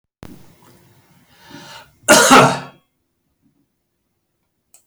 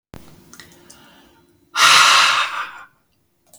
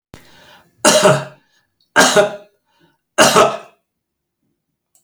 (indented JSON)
{
  "cough_length": "4.9 s",
  "cough_amplitude": 32768,
  "cough_signal_mean_std_ratio": 0.27,
  "exhalation_length": "3.6 s",
  "exhalation_amplitude": 32768,
  "exhalation_signal_mean_std_ratio": 0.41,
  "three_cough_length": "5.0 s",
  "three_cough_amplitude": 32768,
  "three_cough_signal_mean_std_ratio": 0.38,
  "survey_phase": "beta (2021-08-13 to 2022-03-07)",
  "age": "65+",
  "gender": "Male",
  "wearing_mask": "No",
  "symptom_none": true,
  "smoker_status": "Ex-smoker",
  "respiratory_condition_asthma": false,
  "respiratory_condition_other": false,
  "recruitment_source": "REACT",
  "submission_delay": "0 days",
  "covid_test_result": "Negative",
  "covid_test_method": "RT-qPCR",
  "influenza_a_test_result": "Negative",
  "influenza_b_test_result": "Negative"
}